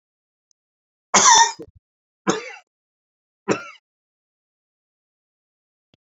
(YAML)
three_cough_length: 6.1 s
three_cough_amplitude: 30723
three_cough_signal_mean_std_ratio: 0.24
survey_phase: beta (2021-08-13 to 2022-03-07)
age: 18-44
gender: Male
wearing_mask: 'No'
symptom_cough_any: true
symptom_runny_or_blocked_nose: true
symptom_fatigue: true
smoker_status: Never smoked
respiratory_condition_asthma: false
respiratory_condition_other: false
recruitment_source: Test and Trace
submission_delay: 2 days
covid_test_result: Positive
covid_test_method: ePCR